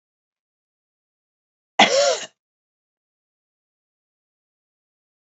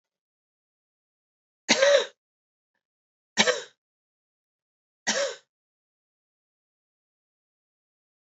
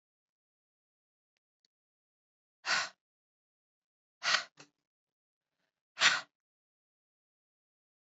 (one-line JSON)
{"cough_length": "5.2 s", "cough_amplitude": 30462, "cough_signal_mean_std_ratio": 0.21, "three_cough_length": "8.4 s", "three_cough_amplitude": 18794, "three_cough_signal_mean_std_ratio": 0.23, "exhalation_length": "8.0 s", "exhalation_amplitude": 11094, "exhalation_signal_mean_std_ratio": 0.2, "survey_phase": "beta (2021-08-13 to 2022-03-07)", "age": "18-44", "gender": "Female", "wearing_mask": "No", "symptom_cough_any": true, "symptom_runny_or_blocked_nose": true, "symptom_abdominal_pain": true, "symptom_diarrhoea": true, "symptom_fatigue": true, "symptom_headache": true, "symptom_change_to_sense_of_smell_or_taste": true, "symptom_onset": "3 days", "smoker_status": "Never smoked", "respiratory_condition_asthma": true, "respiratory_condition_other": false, "recruitment_source": "Test and Trace", "submission_delay": "2 days", "covid_test_result": "Positive", "covid_test_method": "RT-qPCR", "covid_ct_value": 20.0, "covid_ct_gene": "ORF1ab gene", "covid_ct_mean": 21.0, "covid_viral_load": "130000 copies/ml", "covid_viral_load_category": "Low viral load (10K-1M copies/ml)"}